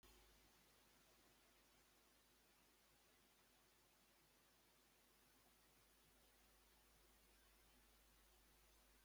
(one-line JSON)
{"exhalation_length": "9.0 s", "exhalation_amplitude": 44, "exhalation_signal_mean_std_ratio": 1.17, "survey_phase": "beta (2021-08-13 to 2022-03-07)", "age": "65+", "gender": "Male", "wearing_mask": "No", "symptom_runny_or_blocked_nose": true, "symptom_onset": "8 days", "smoker_status": "Never smoked", "respiratory_condition_asthma": false, "respiratory_condition_other": false, "recruitment_source": "REACT", "submission_delay": "2 days", "covid_test_result": "Negative", "covid_test_method": "RT-qPCR"}